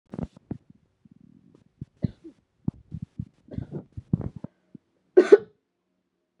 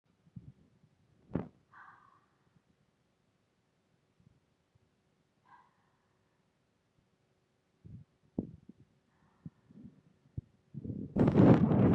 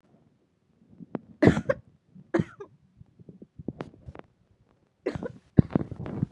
three_cough_length: 6.4 s
three_cough_amplitude: 28772
three_cough_signal_mean_std_ratio: 0.18
exhalation_length: 11.9 s
exhalation_amplitude: 12041
exhalation_signal_mean_std_ratio: 0.24
cough_length: 6.3 s
cough_amplitude: 26095
cough_signal_mean_std_ratio: 0.25
survey_phase: beta (2021-08-13 to 2022-03-07)
age: 18-44
gender: Female
wearing_mask: 'No'
symptom_cough_any: true
symptom_headache: true
symptom_onset: 3 days
smoker_status: Never smoked
respiratory_condition_asthma: false
respiratory_condition_other: false
recruitment_source: Test and Trace
submission_delay: 2 days
covid_test_result: Positive
covid_test_method: RT-qPCR
covid_ct_value: 22.7
covid_ct_gene: N gene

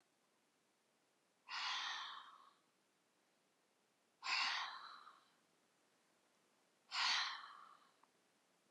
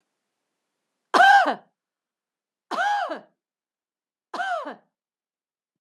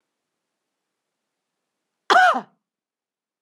exhalation_length: 8.7 s
exhalation_amplitude: 1450
exhalation_signal_mean_std_ratio: 0.39
three_cough_length: 5.8 s
three_cough_amplitude: 22621
three_cough_signal_mean_std_ratio: 0.31
cough_length: 3.4 s
cough_amplitude: 23452
cough_signal_mean_std_ratio: 0.23
survey_phase: beta (2021-08-13 to 2022-03-07)
age: 45-64
gender: Female
wearing_mask: 'No'
symptom_none: true
smoker_status: Never smoked
respiratory_condition_asthma: false
respiratory_condition_other: false
recruitment_source: REACT
submission_delay: 2 days
covid_test_result: Negative
covid_test_method: RT-qPCR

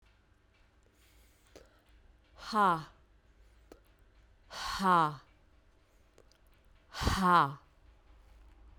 exhalation_length: 8.8 s
exhalation_amplitude: 6874
exhalation_signal_mean_std_ratio: 0.32
survey_phase: beta (2021-08-13 to 2022-03-07)
age: 45-64
gender: Female
wearing_mask: 'No'
symptom_runny_or_blocked_nose: true
symptom_fever_high_temperature: true
symptom_other: true
symptom_onset: 3 days
smoker_status: Never smoked
respiratory_condition_asthma: false
respiratory_condition_other: false
recruitment_source: Test and Trace
submission_delay: 1 day
covid_test_result: Positive
covid_test_method: RT-qPCR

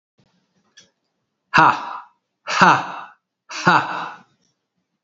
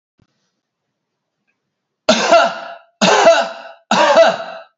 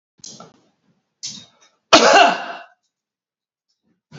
exhalation_length: 5.0 s
exhalation_amplitude: 27886
exhalation_signal_mean_std_ratio: 0.34
three_cough_length: 4.8 s
three_cough_amplitude: 32768
three_cough_signal_mean_std_ratio: 0.47
cough_length: 4.2 s
cough_amplitude: 31731
cough_signal_mean_std_ratio: 0.29
survey_phase: beta (2021-08-13 to 2022-03-07)
age: 45-64
gender: Male
wearing_mask: 'No'
symptom_none: true
smoker_status: Ex-smoker
respiratory_condition_asthma: false
respiratory_condition_other: false
recruitment_source: Test and Trace
submission_delay: 2 days
covid_test_result: Positive
covid_test_method: RT-qPCR
covid_ct_value: 29.8
covid_ct_gene: N gene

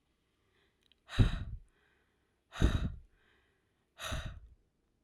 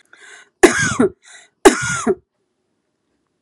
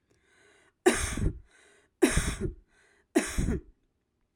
exhalation_length: 5.0 s
exhalation_amplitude: 7232
exhalation_signal_mean_std_ratio: 0.3
cough_length: 3.4 s
cough_amplitude: 32768
cough_signal_mean_std_ratio: 0.34
three_cough_length: 4.4 s
three_cough_amplitude: 12009
three_cough_signal_mean_std_ratio: 0.4
survey_phase: alpha (2021-03-01 to 2021-08-12)
age: 18-44
gender: Female
wearing_mask: 'No'
symptom_none: true
smoker_status: Never smoked
respiratory_condition_asthma: false
respiratory_condition_other: false
recruitment_source: REACT
submission_delay: 0 days
covid_test_result: Negative
covid_test_method: RT-qPCR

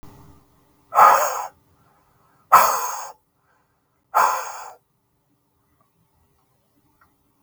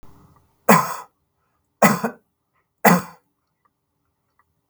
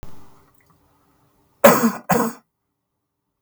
exhalation_length: 7.4 s
exhalation_amplitude: 32768
exhalation_signal_mean_std_ratio: 0.3
three_cough_length: 4.7 s
three_cough_amplitude: 32766
three_cough_signal_mean_std_ratio: 0.27
cough_length: 3.4 s
cough_amplitude: 32768
cough_signal_mean_std_ratio: 0.3
survey_phase: beta (2021-08-13 to 2022-03-07)
age: 45-64
gender: Male
wearing_mask: 'No'
symptom_none: true
symptom_onset: 12 days
smoker_status: Never smoked
respiratory_condition_asthma: false
respiratory_condition_other: false
recruitment_source: REACT
submission_delay: 4 days
covid_test_result: Negative
covid_test_method: RT-qPCR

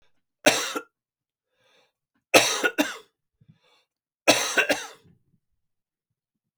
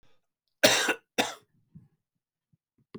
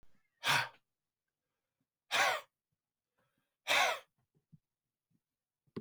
three_cough_length: 6.6 s
three_cough_amplitude: 30584
three_cough_signal_mean_std_ratio: 0.3
cough_length: 3.0 s
cough_amplitude: 21656
cough_signal_mean_std_ratio: 0.28
exhalation_length: 5.8 s
exhalation_amplitude: 4589
exhalation_signal_mean_std_ratio: 0.3
survey_phase: beta (2021-08-13 to 2022-03-07)
age: 45-64
gender: Male
wearing_mask: 'No'
symptom_cough_any: true
symptom_sore_throat: true
smoker_status: Never smoked
respiratory_condition_asthma: false
respiratory_condition_other: false
recruitment_source: REACT
submission_delay: 1 day
covid_test_result: Negative
covid_test_method: RT-qPCR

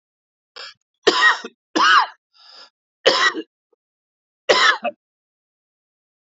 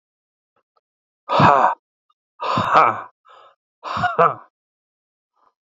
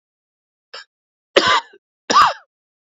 three_cough_length: 6.2 s
three_cough_amplitude: 29794
three_cough_signal_mean_std_ratio: 0.36
exhalation_length: 5.6 s
exhalation_amplitude: 27664
exhalation_signal_mean_std_ratio: 0.37
cough_length: 2.8 s
cough_amplitude: 29106
cough_signal_mean_std_ratio: 0.33
survey_phase: beta (2021-08-13 to 2022-03-07)
age: 45-64
gender: Male
wearing_mask: 'No'
symptom_cough_any: true
symptom_new_continuous_cough: true
symptom_runny_or_blocked_nose: true
symptom_fatigue: true
symptom_fever_high_temperature: true
symptom_headache: true
symptom_change_to_sense_of_smell_or_taste: true
symptom_loss_of_taste: true
symptom_other: true
symptom_onset: 5 days
smoker_status: Ex-smoker
respiratory_condition_asthma: false
respiratory_condition_other: false
recruitment_source: Test and Trace
submission_delay: 2 days
covid_test_result: Positive
covid_test_method: RT-qPCR
covid_ct_value: 15.2
covid_ct_gene: ORF1ab gene
covid_ct_mean: 15.4
covid_viral_load: 8900000 copies/ml
covid_viral_load_category: High viral load (>1M copies/ml)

